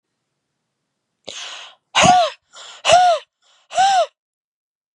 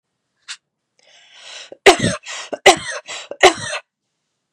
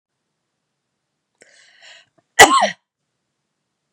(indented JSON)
{
  "exhalation_length": "4.9 s",
  "exhalation_amplitude": 31881,
  "exhalation_signal_mean_std_ratio": 0.41,
  "three_cough_length": "4.5 s",
  "three_cough_amplitude": 32768,
  "three_cough_signal_mean_std_ratio": 0.29,
  "cough_length": "3.9 s",
  "cough_amplitude": 32768,
  "cough_signal_mean_std_ratio": 0.2,
  "survey_phase": "beta (2021-08-13 to 2022-03-07)",
  "age": "45-64",
  "gender": "Female",
  "wearing_mask": "No",
  "symptom_cough_any": true,
  "symptom_runny_or_blocked_nose": true,
  "symptom_sore_throat": true,
  "symptom_onset": "6 days",
  "smoker_status": "Never smoked",
  "respiratory_condition_asthma": false,
  "respiratory_condition_other": false,
  "recruitment_source": "REACT",
  "submission_delay": "2 days",
  "covid_test_result": "Negative",
  "covid_test_method": "RT-qPCR",
  "influenza_a_test_result": "Unknown/Void",
  "influenza_b_test_result": "Unknown/Void"
}